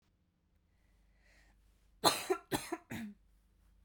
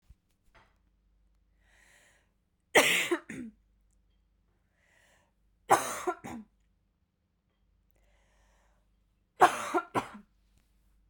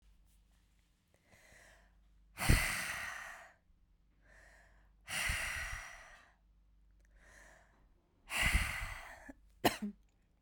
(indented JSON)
{
  "cough_length": "3.8 s",
  "cough_amplitude": 10235,
  "cough_signal_mean_std_ratio": 0.29,
  "three_cough_length": "11.1 s",
  "three_cough_amplitude": 15916,
  "three_cough_signal_mean_std_ratio": 0.24,
  "exhalation_length": "10.4 s",
  "exhalation_amplitude": 7717,
  "exhalation_signal_mean_std_ratio": 0.37,
  "survey_phase": "beta (2021-08-13 to 2022-03-07)",
  "age": "18-44",
  "gender": "Female",
  "wearing_mask": "No",
  "symptom_cough_any": true,
  "symptom_runny_or_blocked_nose": true,
  "symptom_fatigue": true,
  "smoker_status": "Never smoked",
  "respiratory_condition_asthma": false,
  "respiratory_condition_other": false,
  "recruitment_source": "Test and Trace",
  "submission_delay": "2 days",
  "covid_test_result": "Positive",
  "covid_test_method": "RT-qPCR",
  "covid_ct_value": 27.1,
  "covid_ct_gene": "ORF1ab gene",
  "covid_ct_mean": 27.1,
  "covid_viral_load": "1300 copies/ml",
  "covid_viral_load_category": "Minimal viral load (< 10K copies/ml)"
}